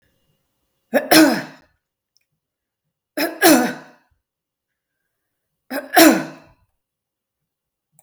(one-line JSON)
{"three_cough_length": "8.0 s", "three_cough_amplitude": 32768, "three_cough_signal_mean_std_ratio": 0.29, "survey_phase": "beta (2021-08-13 to 2022-03-07)", "age": "45-64", "gender": "Female", "wearing_mask": "No", "symptom_none": true, "smoker_status": "Never smoked", "respiratory_condition_asthma": false, "respiratory_condition_other": false, "recruitment_source": "REACT", "submission_delay": "1 day", "covid_test_result": "Negative", "covid_test_method": "RT-qPCR", "influenza_a_test_result": "Negative", "influenza_b_test_result": "Negative"}